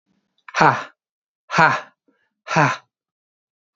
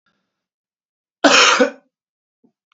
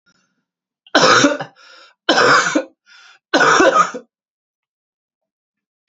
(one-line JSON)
{"exhalation_length": "3.8 s", "exhalation_amplitude": 32768, "exhalation_signal_mean_std_ratio": 0.33, "cough_length": "2.7 s", "cough_amplitude": 32768, "cough_signal_mean_std_ratio": 0.32, "three_cough_length": "5.9 s", "three_cough_amplitude": 32767, "three_cough_signal_mean_std_ratio": 0.42, "survey_phase": "alpha (2021-03-01 to 2021-08-12)", "age": "18-44", "gender": "Male", "wearing_mask": "No", "symptom_fatigue": true, "symptom_headache": true, "smoker_status": "Never smoked", "respiratory_condition_asthma": false, "respiratory_condition_other": false, "recruitment_source": "Test and Trace", "submission_delay": "1 day", "covid_test_result": "Positive", "covid_test_method": "RT-qPCR", "covid_ct_value": 20.9, "covid_ct_gene": "ORF1ab gene", "covid_ct_mean": 21.0, "covid_viral_load": "130000 copies/ml", "covid_viral_load_category": "Low viral load (10K-1M copies/ml)"}